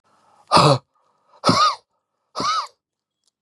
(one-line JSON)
{"exhalation_length": "3.4 s", "exhalation_amplitude": 30702, "exhalation_signal_mean_std_ratio": 0.38, "survey_phase": "beta (2021-08-13 to 2022-03-07)", "age": "45-64", "gender": "Male", "wearing_mask": "No", "symptom_fatigue": true, "symptom_onset": "12 days", "smoker_status": "Ex-smoker", "respiratory_condition_asthma": false, "respiratory_condition_other": false, "recruitment_source": "REACT", "submission_delay": "1 day", "covid_test_result": "Negative", "covid_test_method": "RT-qPCR", "influenza_a_test_result": "Negative", "influenza_b_test_result": "Negative"}